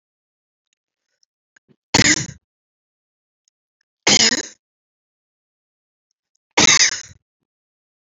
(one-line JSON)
{"three_cough_length": "8.2 s", "three_cough_amplitude": 32564, "three_cough_signal_mean_std_ratio": 0.26, "survey_phase": "beta (2021-08-13 to 2022-03-07)", "age": "45-64", "gender": "Female", "wearing_mask": "No", "symptom_cough_any": true, "symptom_runny_or_blocked_nose": true, "symptom_sore_throat": true, "symptom_fatigue": true, "smoker_status": "Never smoked", "respiratory_condition_asthma": true, "respiratory_condition_other": false, "recruitment_source": "Test and Trace", "submission_delay": "1 day", "covid_test_result": "Positive", "covid_test_method": "RT-qPCR", "covid_ct_value": 27.4, "covid_ct_gene": "ORF1ab gene"}